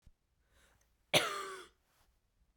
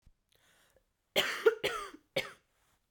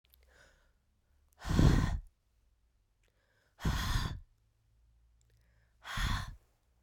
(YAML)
cough_length: 2.6 s
cough_amplitude: 8249
cough_signal_mean_std_ratio: 0.27
three_cough_length: 2.9 s
three_cough_amplitude: 7167
three_cough_signal_mean_std_ratio: 0.32
exhalation_length: 6.8 s
exhalation_amplitude: 7771
exhalation_signal_mean_std_ratio: 0.35
survey_phase: beta (2021-08-13 to 2022-03-07)
age: 18-44
gender: Female
wearing_mask: 'No'
symptom_cough_any: true
symptom_runny_or_blocked_nose: true
symptom_sore_throat: true
symptom_headache: true
smoker_status: Never smoked
respiratory_condition_asthma: false
respiratory_condition_other: false
recruitment_source: Test and Trace
submission_delay: 1 day
covid_test_result: Positive
covid_test_method: ePCR